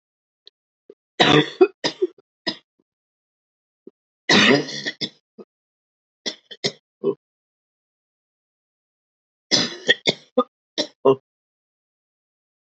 {"three_cough_length": "12.7 s", "three_cough_amplitude": 29772, "three_cough_signal_mean_std_ratio": 0.28, "survey_phase": "beta (2021-08-13 to 2022-03-07)", "age": "45-64", "gender": "Female", "wearing_mask": "No", "symptom_new_continuous_cough": true, "symptom_runny_or_blocked_nose": true, "symptom_shortness_of_breath": true, "symptom_sore_throat": true, "symptom_diarrhoea": true, "symptom_fatigue": true, "symptom_fever_high_temperature": true, "symptom_change_to_sense_of_smell_or_taste": true, "smoker_status": "Ex-smoker", "respiratory_condition_asthma": false, "respiratory_condition_other": false, "recruitment_source": "Test and Trace", "submission_delay": "2 days", "covid_test_result": "Positive", "covid_test_method": "LFT"}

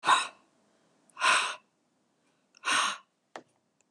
{"exhalation_length": "3.9 s", "exhalation_amplitude": 10798, "exhalation_signal_mean_std_ratio": 0.37, "survey_phase": "beta (2021-08-13 to 2022-03-07)", "age": "65+", "gender": "Female", "wearing_mask": "No", "symptom_runny_or_blocked_nose": true, "symptom_sore_throat": true, "symptom_onset": "2 days", "smoker_status": "Never smoked", "respiratory_condition_asthma": false, "respiratory_condition_other": false, "recruitment_source": "Test and Trace", "submission_delay": "1 day", "covid_test_result": "Positive", "covid_test_method": "RT-qPCR", "covid_ct_value": 24.1, "covid_ct_gene": "N gene"}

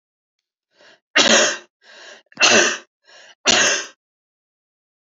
{"three_cough_length": "5.1 s", "three_cough_amplitude": 29618, "three_cough_signal_mean_std_ratio": 0.38, "survey_phase": "beta (2021-08-13 to 2022-03-07)", "age": "18-44", "gender": "Female", "wearing_mask": "No", "symptom_runny_or_blocked_nose": true, "smoker_status": "Never smoked", "respiratory_condition_asthma": false, "respiratory_condition_other": false, "recruitment_source": "Test and Trace", "submission_delay": "2 days", "covid_test_result": "Positive", "covid_test_method": "ePCR"}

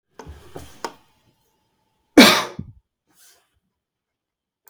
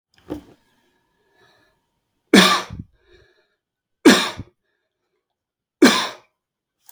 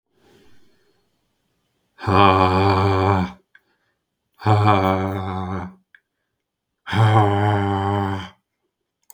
{"cough_length": "4.7 s", "cough_amplitude": 32768, "cough_signal_mean_std_ratio": 0.2, "three_cough_length": "6.9 s", "three_cough_amplitude": 32767, "three_cough_signal_mean_std_ratio": 0.26, "exhalation_length": "9.1 s", "exhalation_amplitude": 32766, "exhalation_signal_mean_std_ratio": 0.5, "survey_phase": "beta (2021-08-13 to 2022-03-07)", "age": "45-64", "gender": "Male", "wearing_mask": "No", "symptom_none": true, "smoker_status": "Ex-smoker", "respiratory_condition_asthma": true, "respiratory_condition_other": false, "recruitment_source": "REACT", "submission_delay": "2 days", "covid_test_result": "Negative", "covid_test_method": "RT-qPCR"}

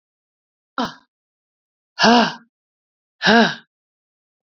{"exhalation_length": "4.4 s", "exhalation_amplitude": 28997, "exhalation_signal_mean_std_ratio": 0.3, "survey_phase": "beta (2021-08-13 to 2022-03-07)", "age": "45-64", "gender": "Female", "wearing_mask": "No", "symptom_cough_any": true, "symptom_runny_or_blocked_nose": true, "symptom_onset": "4 days", "smoker_status": "Ex-smoker", "respiratory_condition_asthma": false, "respiratory_condition_other": false, "recruitment_source": "Test and Trace", "submission_delay": "2 days", "covid_test_result": "Positive", "covid_test_method": "RT-qPCR", "covid_ct_value": 35.0, "covid_ct_gene": "ORF1ab gene"}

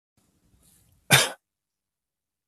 {"cough_length": "2.5 s", "cough_amplitude": 22937, "cough_signal_mean_std_ratio": 0.2, "survey_phase": "beta (2021-08-13 to 2022-03-07)", "age": "45-64", "gender": "Male", "wearing_mask": "No", "symptom_none": true, "smoker_status": "Never smoked", "respiratory_condition_asthma": false, "respiratory_condition_other": false, "recruitment_source": "Test and Trace", "submission_delay": "1 day", "covid_test_result": "Negative", "covid_test_method": "RT-qPCR"}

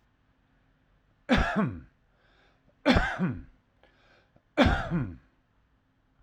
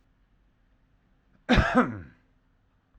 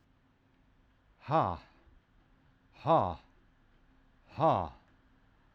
{"three_cough_length": "6.2 s", "three_cough_amplitude": 13656, "three_cough_signal_mean_std_ratio": 0.37, "cough_length": "3.0 s", "cough_amplitude": 13303, "cough_signal_mean_std_ratio": 0.3, "exhalation_length": "5.5 s", "exhalation_amplitude": 6034, "exhalation_signal_mean_std_ratio": 0.31, "survey_phase": "alpha (2021-03-01 to 2021-08-12)", "age": "45-64", "gender": "Male", "wearing_mask": "No", "symptom_loss_of_taste": true, "symptom_onset": "4 days", "smoker_status": "Current smoker (1 to 10 cigarettes per day)", "respiratory_condition_asthma": false, "respiratory_condition_other": false, "recruitment_source": "REACT", "submission_delay": "1 day", "covid_test_result": "Negative", "covid_test_method": "RT-qPCR", "covid_ct_value": 41.0, "covid_ct_gene": "N gene"}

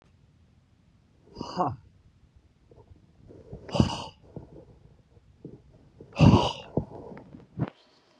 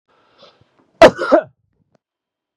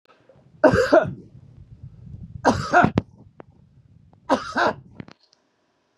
{"exhalation_length": "8.2 s", "exhalation_amplitude": 22385, "exhalation_signal_mean_std_ratio": 0.27, "cough_length": "2.6 s", "cough_amplitude": 32768, "cough_signal_mean_std_ratio": 0.24, "three_cough_length": "6.0 s", "three_cough_amplitude": 29633, "three_cough_signal_mean_std_ratio": 0.36, "survey_phase": "beta (2021-08-13 to 2022-03-07)", "age": "45-64", "gender": "Male", "wearing_mask": "No", "symptom_cough_any": true, "symptom_runny_or_blocked_nose": true, "symptom_fatigue": true, "smoker_status": "Never smoked", "respiratory_condition_asthma": false, "respiratory_condition_other": false, "recruitment_source": "REACT", "submission_delay": "1 day", "covid_test_result": "Negative", "covid_test_method": "RT-qPCR", "influenza_a_test_result": "Negative", "influenza_b_test_result": "Negative"}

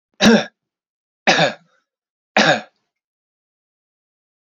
{"three_cough_length": "4.4 s", "three_cough_amplitude": 29850, "three_cough_signal_mean_std_ratio": 0.31, "survey_phase": "beta (2021-08-13 to 2022-03-07)", "age": "18-44", "gender": "Male", "wearing_mask": "No", "symptom_cough_any": true, "symptom_runny_or_blocked_nose": true, "symptom_sore_throat": true, "symptom_fatigue": true, "symptom_fever_high_temperature": true, "symptom_headache": true, "smoker_status": "Ex-smoker", "respiratory_condition_asthma": false, "respiratory_condition_other": false, "recruitment_source": "Test and Trace", "submission_delay": "1 day", "covid_test_result": "Positive", "covid_test_method": "LFT"}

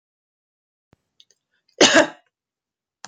{"cough_length": "3.1 s", "cough_amplitude": 32768, "cough_signal_mean_std_ratio": 0.22, "survey_phase": "alpha (2021-03-01 to 2021-08-12)", "age": "18-44", "gender": "Female", "wearing_mask": "No", "symptom_none": true, "symptom_onset": "12 days", "smoker_status": "Never smoked", "respiratory_condition_asthma": false, "respiratory_condition_other": false, "recruitment_source": "REACT", "submission_delay": "1 day", "covid_test_result": "Negative", "covid_test_method": "RT-qPCR"}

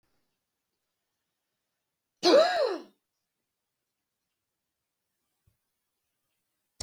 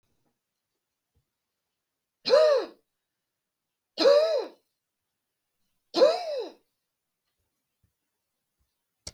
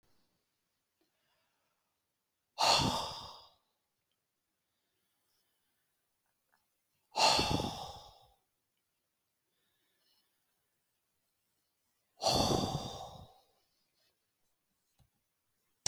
{"cough_length": "6.8 s", "cough_amplitude": 10639, "cough_signal_mean_std_ratio": 0.22, "three_cough_length": "9.1 s", "three_cough_amplitude": 12374, "three_cough_signal_mean_std_ratio": 0.3, "exhalation_length": "15.9 s", "exhalation_amplitude": 6588, "exhalation_signal_mean_std_ratio": 0.27, "survey_phase": "beta (2021-08-13 to 2022-03-07)", "age": "45-64", "gender": "Female", "wearing_mask": "No", "symptom_cough_any": true, "symptom_other": true, "symptom_onset": "5 days", "smoker_status": "Ex-smoker", "respiratory_condition_asthma": false, "respiratory_condition_other": false, "recruitment_source": "REACT", "submission_delay": "3 days", "covid_test_result": "Negative", "covid_test_method": "RT-qPCR", "influenza_a_test_result": "Negative", "influenza_b_test_result": "Negative"}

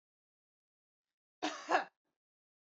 {"cough_length": "2.6 s", "cough_amplitude": 5042, "cough_signal_mean_std_ratio": 0.24, "survey_phase": "beta (2021-08-13 to 2022-03-07)", "age": "18-44", "gender": "Female", "wearing_mask": "No", "symptom_none": true, "smoker_status": "Ex-smoker", "respiratory_condition_asthma": false, "respiratory_condition_other": false, "recruitment_source": "Test and Trace", "submission_delay": "1 day", "covid_test_result": "Negative", "covid_test_method": "RT-qPCR"}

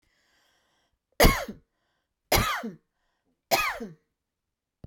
{"three_cough_length": "4.9 s", "three_cough_amplitude": 20203, "three_cough_signal_mean_std_ratio": 0.3, "survey_phase": "beta (2021-08-13 to 2022-03-07)", "age": "65+", "gender": "Female", "wearing_mask": "No", "symptom_none": true, "smoker_status": "Never smoked", "respiratory_condition_asthma": false, "respiratory_condition_other": false, "recruitment_source": "REACT", "submission_delay": "2 days", "covid_test_result": "Negative", "covid_test_method": "RT-qPCR"}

